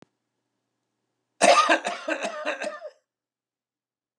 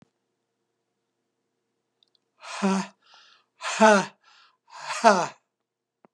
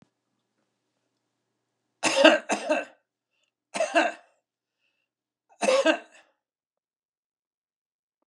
cough_length: 4.2 s
cough_amplitude: 19628
cough_signal_mean_std_ratio: 0.34
exhalation_length: 6.1 s
exhalation_amplitude: 24943
exhalation_signal_mean_std_ratio: 0.28
three_cough_length: 8.3 s
three_cough_amplitude: 32368
three_cough_signal_mean_std_ratio: 0.28
survey_phase: beta (2021-08-13 to 2022-03-07)
age: 65+
gender: Male
wearing_mask: 'No'
symptom_none: true
smoker_status: Never smoked
respiratory_condition_asthma: false
respiratory_condition_other: false
recruitment_source: REACT
submission_delay: 5 days
covid_test_result: Negative
covid_test_method: RT-qPCR
influenza_a_test_result: Negative
influenza_b_test_result: Negative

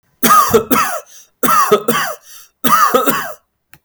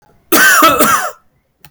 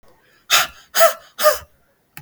three_cough_length: 3.8 s
three_cough_amplitude: 32768
three_cough_signal_mean_std_ratio: 0.62
cough_length: 1.7 s
cough_amplitude: 32768
cough_signal_mean_std_ratio: 0.64
exhalation_length: 2.2 s
exhalation_amplitude: 32768
exhalation_signal_mean_std_ratio: 0.38
survey_phase: beta (2021-08-13 to 2022-03-07)
age: 18-44
gender: Male
wearing_mask: 'No'
symptom_none: true
smoker_status: Ex-smoker
respiratory_condition_asthma: false
respiratory_condition_other: false
recruitment_source: REACT
submission_delay: 4 days
covid_test_result: Negative
covid_test_method: RT-qPCR
influenza_a_test_result: Negative
influenza_b_test_result: Negative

